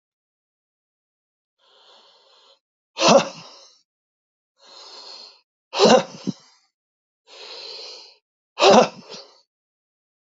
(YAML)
exhalation_length: 10.2 s
exhalation_amplitude: 28458
exhalation_signal_mean_std_ratio: 0.25
survey_phase: beta (2021-08-13 to 2022-03-07)
age: 65+
gender: Male
wearing_mask: 'No'
symptom_none: true
smoker_status: Never smoked
respiratory_condition_asthma: false
respiratory_condition_other: false
recruitment_source: REACT
submission_delay: 3 days
covid_test_result: Negative
covid_test_method: RT-qPCR
influenza_a_test_result: Negative
influenza_b_test_result: Negative